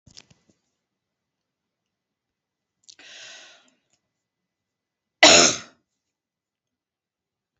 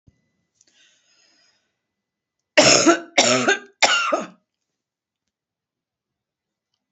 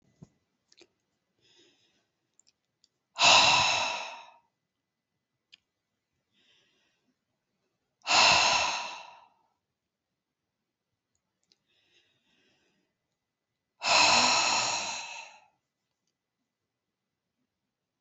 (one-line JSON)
{"cough_length": "7.6 s", "cough_amplitude": 30175, "cough_signal_mean_std_ratio": 0.17, "three_cough_length": "6.9 s", "three_cough_amplitude": 29786, "three_cough_signal_mean_std_ratio": 0.32, "exhalation_length": "18.0 s", "exhalation_amplitude": 14772, "exhalation_signal_mean_std_ratio": 0.31, "survey_phase": "beta (2021-08-13 to 2022-03-07)", "age": "65+", "gender": "Female", "wearing_mask": "No", "symptom_cough_any": true, "smoker_status": "Ex-smoker", "respiratory_condition_asthma": false, "respiratory_condition_other": false, "recruitment_source": "Test and Trace", "submission_delay": "1 day", "covid_test_result": "Positive", "covid_test_method": "RT-qPCR", "covid_ct_value": 26.4, "covid_ct_gene": "ORF1ab gene"}